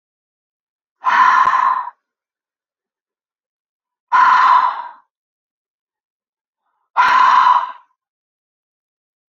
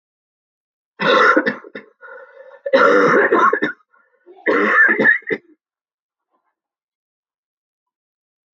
{"exhalation_length": "9.3 s", "exhalation_amplitude": 31125, "exhalation_signal_mean_std_ratio": 0.41, "cough_length": "8.5 s", "cough_amplitude": 32499, "cough_signal_mean_std_ratio": 0.44, "survey_phase": "beta (2021-08-13 to 2022-03-07)", "age": "45-64", "gender": "Female", "wearing_mask": "No", "symptom_cough_any": true, "symptom_runny_or_blocked_nose": true, "symptom_shortness_of_breath": true, "symptom_sore_throat": true, "symptom_fever_high_temperature": true, "symptom_headache": true, "symptom_change_to_sense_of_smell_or_taste": true, "symptom_loss_of_taste": true, "symptom_onset": "3 days", "smoker_status": "Never smoked", "respiratory_condition_asthma": true, "respiratory_condition_other": false, "recruitment_source": "Test and Trace", "submission_delay": "1 day", "covid_test_result": "Positive", "covid_test_method": "RT-qPCR", "covid_ct_value": 15.9, "covid_ct_gene": "ORF1ab gene"}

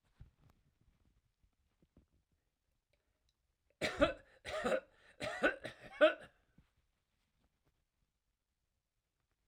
{"three_cough_length": "9.5 s", "three_cough_amplitude": 4926, "three_cough_signal_mean_std_ratio": 0.24, "survey_phase": "alpha (2021-03-01 to 2021-08-12)", "age": "65+", "gender": "Male", "wearing_mask": "No", "symptom_none": true, "smoker_status": "Never smoked", "respiratory_condition_asthma": false, "respiratory_condition_other": false, "recruitment_source": "REACT", "submission_delay": "3 days", "covid_test_result": "Negative", "covid_test_method": "RT-qPCR"}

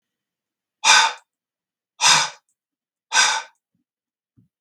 {"exhalation_length": "4.6 s", "exhalation_amplitude": 32766, "exhalation_signal_mean_std_ratio": 0.33, "survey_phase": "beta (2021-08-13 to 2022-03-07)", "age": "45-64", "gender": "Male", "wearing_mask": "No", "symptom_none": true, "smoker_status": "Never smoked", "respiratory_condition_asthma": false, "respiratory_condition_other": false, "recruitment_source": "REACT", "submission_delay": "2 days", "covid_test_result": "Negative", "covid_test_method": "RT-qPCR"}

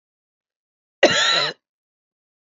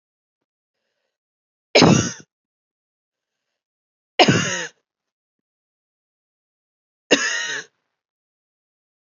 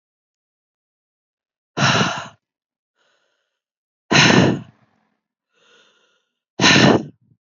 {"cough_length": "2.5 s", "cough_amplitude": 28948, "cough_signal_mean_std_ratio": 0.34, "three_cough_length": "9.1 s", "three_cough_amplitude": 32768, "three_cough_signal_mean_std_ratio": 0.25, "exhalation_length": "7.6 s", "exhalation_amplitude": 30107, "exhalation_signal_mean_std_ratio": 0.33, "survey_phase": "alpha (2021-03-01 to 2021-08-12)", "age": "18-44", "gender": "Female", "wearing_mask": "No", "symptom_cough_any": true, "symptom_new_continuous_cough": true, "symptom_fatigue": true, "symptom_change_to_sense_of_smell_or_taste": true, "symptom_loss_of_taste": true, "symptom_onset": "3 days", "smoker_status": "Never smoked", "respiratory_condition_asthma": false, "respiratory_condition_other": false, "recruitment_source": "Test and Trace", "submission_delay": "2 days", "covid_test_result": "Positive", "covid_test_method": "RT-qPCR", "covid_ct_value": 15.0, "covid_ct_gene": "ORF1ab gene", "covid_ct_mean": 15.4, "covid_viral_load": "9000000 copies/ml", "covid_viral_load_category": "High viral load (>1M copies/ml)"}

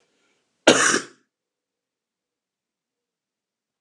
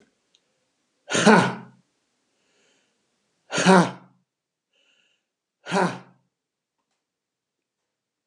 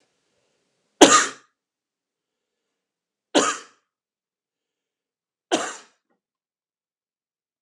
{"cough_length": "3.8 s", "cough_amplitude": 32536, "cough_signal_mean_std_ratio": 0.21, "exhalation_length": "8.3 s", "exhalation_amplitude": 30628, "exhalation_signal_mean_std_ratio": 0.25, "three_cough_length": "7.6 s", "three_cough_amplitude": 32768, "three_cough_signal_mean_std_ratio": 0.19, "survey_phase": "alpha (2021-03-01 to 2021-08-12)", "age": "65+", "gender": "Male", "wearing_mask": "No", "symptom_none": true, "smoker_status": "Never smoked", "respiratory_condition_asthma": false, "respiratory_condition_other": false, "recruitment_source": "REACT", "submission_delay": "2 days", "covid_test_result": "Negative", "covid_test_method": "RT-qPCR"}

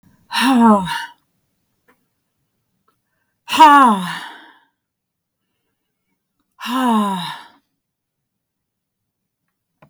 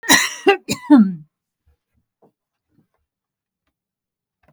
{"exhalation_length": "9.9 s", "exhalation_amplitude": 32768, "exhalation_signal_mean_std_ratio": 0.33, "cough_length": "4.5 s", "cough_amplitude": 32768, "cough_signal_mean_std_ratio": 0.28, "survey_phase": "beta (2021-08-13 to 2022-03-07)", "age": "45-64", "gender": "Female", "wearing_mask": "No", "symptom_none": true, "smoker_status": "Never smoked", "respiratory_condition_asthma": false, "respiratory_condition_other": false, "recruitment_source": "REACT", "submission_delay": "1 day", "covid_test_result": "Negative", "covid_test_method": "RT-qPCR", "influenza_a_test_result": "Negative", "influenza_b_test_result": "Negative"}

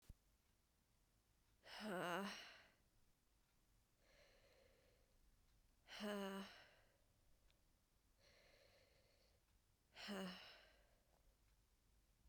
{"exhalation_length": "12.3 s", "exhalation_amplitude": 632, "exhalation_signal_mean_std_ratio": 0.38, "survey_phase": "beta (2021-08-13 to 2022-03-07)", "age": "18-44", "gender": "Female", "wearing_mask": "No", "symptom_cough_any": true, "symptom_runny_or_blocked_nose": true, "symptom_shortness_of_breath": true, "symptom_sore_throat": true, "symptom_fatigue": true, "symptom_fever_high_temperature": true, "symptom_headache": true, "symptom_change_to_sense_of_smell_or_taste": true, "symptom_other": true, "symptom_onset": "4 days", "smoker_status": "Never smoked", "respiratory_condition_asthma": false, "respiratory_condition_other": false, "recruitment_source": "Test and Trace", "submission_delay": "2 days", "covid_test_result": "Positive", "covid_test_method": "RT-qPCR"}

